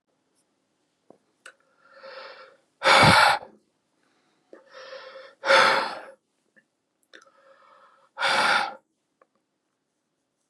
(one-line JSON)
{"exhalation_length": "10.5 s", "exhalation_amplitude": 23216, "exhalation_signal_mean_std_ratio": 0.31, "survey_phase": "beta (2021-08-13 to 2022-03-07)", "age": "45-64", "gender": "Male", "wearing_mask": "No", "symptom_none": true, "smoker_status": "Ex-smoker", "respiratory_condition_asthma": false, "respiratory_condition_other": false, "recruitment_source": "REACT", "submission_delay": "7 days", "covid_test_result": "Negative", "covid_test_method": "RT-qPCR", "influenza_a_test_result": "Negative", "influenza_b_test_result": "Negative"}